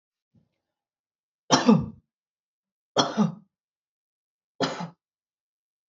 {"three_cough_length": "5.9 s", "three_cough_amplitude": 20011, "three_cough_signal_mean_std_ratio": 0.27, "survey_phase": "beta (2021-08-13 to 2022-03-07)", "age": "18-44", "gender": "Female", "wearing_mask": "No", "symptom_runny_or_blocked_nose": true, "smoker_status": "Never smoked", "respiratory_condition_asthma": false, "respiratory_condition_other": false, "recruitment_source": "Test and Trace", "submission_delay": "0 days", "covid_test_result": "Negative", "covid_test_method": "LFT"}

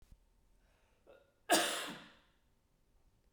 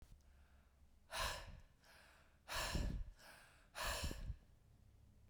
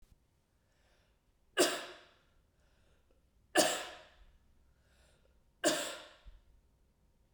{"cough_length": "3.3 s", "cough_amplitude": 6037, "cough_signal_mean_std_ratio": 0.28, "exhalation_length": "5.3 s", "exhalation_amplitude": 1227, "exhalation_signal_mean_std_ratio": 0.54, "three_cough_length": "7.3 s", "three_cough_amplitude": 7058, "three_cough_signal_mean_std_ratio": 0.28, "survey_phase": "beta (2021-08-13 to 2022-03-07)", "age": "45-64", "gender": "Female", "wearing_mask": "No", "symptom_runny_or_blocked_nose": true, "symptom_headache": true, "symptom_other": true, "smoker_status": "Never smoked", "respiratory_condition_asthma": false, "respiratory_condition_other": false, "recruitment_source": "Test and Trace", "submission_delay": "3 days", "covid_test_result": "Positive", "covid_test_method": "RT-qPCR", "covid_ct_value": 18.9, "covid_ct_gene": "ORF1ab gene", "covid_ct_mean": 19.8, "covid_viral_load": "320000 copies/ml", "covid_viral_load_category": "Low viral load (10K-1M copies/ml)"}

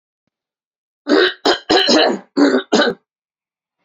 {"cough_length": "3.8 s", "cough_amplitude": 30099, "cough_signal_mean_std_ratio": 0.49, "survey_phase": "beta (2021-08-13 to 2022-03-07)", "age": "45-64", "gender": "Female", "wearing_mask": "No", "symptom_none": true, "smoker_status": "Never smoked", "respiratory_condition_asthma": false, "respiratory_condition_other": false, "recruitment_source": "REACT", "submission_delay": "2 days", "covid_test_result": "Negative", "covid_test_method": "RT-qPCR", "influenza_a_test_result": "Unknown/Void", "influenza_b_test_result": "Unknown/Void"}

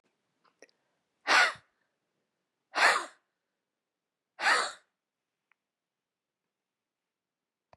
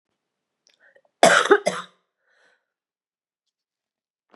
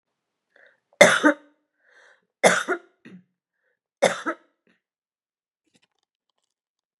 {"exhalation_length": "7.8 s", "exhalation_amplitude": 10925, "exhalation_signal_mean_std_ratio": 0.25, "cough_length": "4.4 s", "cough_amplitude": 32298, "cough_signal_mean_std_ratio": 0.23, "three_cough_length": "7.0 s", "three_cough_amplitude": 32768, "three_cough_signal_mean_std_ratio": 0.23, "survey_phase": "beta (2021-08-13 to 2022-03-07)", "age": "45-64", "gender": "Female", "wearing_mask": "No", "symptom_cough_any": true, "symptom_change_to_sense_of_smell_or_taste": true, "symptom_onset": "11 days", "smoker_status": "Ex-smoker", "respiratory_condition_asthma": false, "respiratory_condition_other": false, "recruitment_source": "REACT", "submission_delay": "1 day", "covid_test_result": "Positive", "covid_test_method": "RT-qPCR", "covid_ct_value": 21.0, "covid_ct_gene": "E gene", "influenza_a_test_result": "Negative", "influenza_b_test_result": "Negative"}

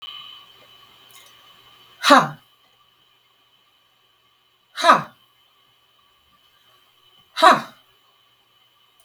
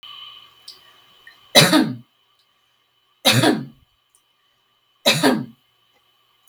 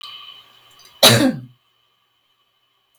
{"exhalation_length": "9.0 s", "exhalation_amplitude": 32768, "exhalation_signal_mean_std_ratio": 0.22, "three_cough_length": "6.5 s", "three_cough_amplitude": 32768, "three_cough_signal_mean_std_ratio": 0.33, "cough_length": "3.0 s", "cough_amplitude": 32768, "cough_signal_mean_std_ratio": 0.28, "survey_phase": "beta (2021-08-13 to 2022-03-07)", "age": "18-44", "gender": "Female", "wearing_mask": "No", "symptom_none": true, "smoker_status": "Never smoked", "respiratory_condition_asthma": false, "respiratory_condition_other": false, "recruitment_source": "REACT", "submission_delay": "1 day", "covid_test_result": "Negative", "covid_test_method": "RT-qPCR", "influenza_a_test_result": "Negative", "influenza_b_test_result": "Negative"}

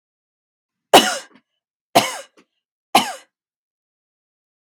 {"three_cough_length": "4.6 s", "three_cough_amplitude": 32768, "three_cough_signal_mean_std_ratio": 0.23, "survey_phase": "beta (2021-08-13 to 2022-03-07)", "age": "18-44", "gender": "Female", "wearing_mask": "No", "symptom_none": true, "smoker_status": "Never smoked", "respiratory_condition_asthma": false, "respiratory_condition_other": false, "recruitment_source": "REACT", "submission_delay": "1 day", "covid_test_result": "Negative", "covid_test_method": "RT-qPCR", "influenza_a_test_result": "Negative", "influenza_b_test_result": "Negative"}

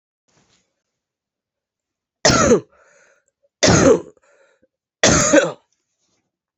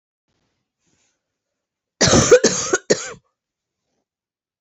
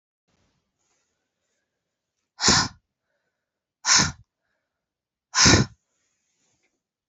{"three_cough_length": "6.6 s", "three_cough_amplitude": 32187, "three_cough_signal_mean_std_ratio": 0.35, "cough_length": "4.6 s", "cough_amplitude": 27708, "cough_signal_mean_std_ratio": 0.3, "exhalation_length": "7.1 s", "exhalation_amplitude": 26892, "exhalation_signal_mean_std_ratio": 0.26, "survey_phase": "beta (2021-08-13 to 2022-03-07)", "age": "45-64", "gender": "Female", "wearing_mask": "No", "symptom_cough_any": true, "symptom_runny_or_blocked_nose": true, "symptom_shortness_of_breath": true, "symptom_sore_throat": true, "symptom_fatigue": true, "symptom_fever_high_temperature": true, "symptom_change_to_sense_of_smell_or_taste": true, "symptom_onset": "5 days", "smoker_status": "Never smoked", "respiratory_condition_asthma": false, "respiratory_condition_other": false, "recruitment_source": "Test and Trace", "submission_delay": "2 days", "covid_test_result": "Positive", "covid_test_method": "RT-qPCR", "covid_ct_value": 23.5, "covid_ct_gene": "ORF1ab gene", "covid_ct_mean": 24.0, "covid_viral_load": "14000 copies/ml", "covid_viral_load_category": "Low viral load (10K-1M copies/ml)"}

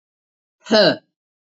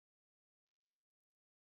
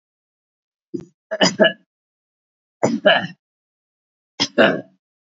{"exhalation_length": "1.5 s", "exhalation_amplitude": 28839, "exhalation_signal_mean_std_ratio": 0.33, "cough_length": "1.7 s", "cough_amplitude": 3, "cough_signal_mean_std_ratio": 0.07, "three_cough_length": "5.4 s", "three_cough_amplitude": 28134, "three_cough_signal_mean_std_ratio": 0.31, "survey_phase": "alpha (2021-03-01 to 2021-08-12)", "age": "65+", "gender": "Female", "wearing_mask": "No", "symptom_none": true, "smoker_status": "Ex-smoker", "respiratory_condition_asthma": false, "respiratory_condition_other": false, "recruitment_source": "REACT", "submission_delay": "2 days", "covid_test_result": "Negative", "covid_test_method": "RT-qPCR"}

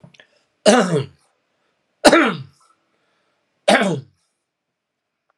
{"three_cough_length": "5.4 s", "three_cough_amplitude": 32768, "three_cough_signal_mean_std_ratio": 0.32, "survey_phase": "alpha (2021-03-01 to 2021-08-12)", "age": "45-64", "gender": "Male", "wearing_mask": "No", "symptom_cough_any": true, "symptom_fatigue": true, "smoker_status": "Ex-smoker", "respiratory_condition_asthma": false, "respiratory_condition_other": false, "recruitment_source": "Test and Trace", "submission_delay": "1 day", "covid_test_result": "Positive", "covid_test_method": "LFT"}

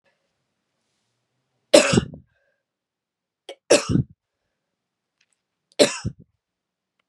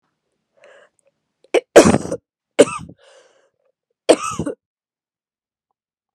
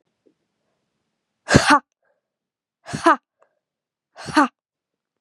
{"three_cough_length": "7.1 s", "three_cough_amplitude": 32768, "three_cough_signal_mean_std_ratio": 0.22, "cough_length": "6.1 s", "cough_amplitude": 32768, "cough_signal_mean_std_ratio": 0.23, "exhalation_length": "5.2 s", "exhalation_amplitude": 32767, "exhalation_signal_mean_std_ratio": 0.25, "survey_phase": "beta (2021-08-13 to 2022-03-07)", "age": "18-44", "gender": "Female", "wearing_mask": "No", "symptom_runny_or_blocked_nose": true, "symptom_shortness_of_breath": true, "symptom_sore_throat": true, "symptom_fatigue": true, "symptom_fever_high_temperature": true, "symptom_headache": true, "symptom_change_to_sense_of_smell_or_taste": true, "symptom_loss_of_taste": true, "symptom_other": true, "symptom_onset": "3 days", "smoker_status": "Never smoked", "respiratory_condition_asthma": false, "respiratory_condition_other": false, "recruitment_source": "Test and Trace", "submission_delay": "2 days", "covid_test_result": "Positive", "covid_test_method": "RT-qPCR", "covid_ct_value": 14.4, "covid_ct_gene": "N gene", "covid_ct_mean": 14.9, "covid_viral_load": "13000000 copies/ml", "covid_viral_load_category": "High viral load (>1M copies/ml)"}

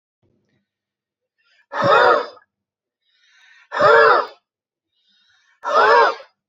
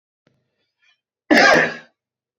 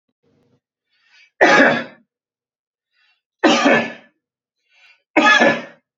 {"exhalation_length": "6.5 s", "exhalation_amplitude": 28239, "exhalation_signal_mean_std_ratio": 0.4, "cough_length": "2.4 s", "cough_amplitude": 28426, "cough_signal_mean_std_ratio": 0.34, "three_cough_length": "6.0 s", "three_cough_amplitude": 32768, "three_cough_signal_mean_std_ratio": 0.38, "survey_phase": "beta (2021-08-13 to 2022-03-07)", "age": "45-64", "gender": "Male", "wearing_mask": "No", "symptom_none": true, "smoker_status": "Ex-smoker", "respiratory_condition_asthma": true, "respiratory_condition_other": false, "recruitment_source": "REACT", "submission_delay": "2 days", "covid_test_result": "Negative", "covid_test_method": "RT-qPCR"}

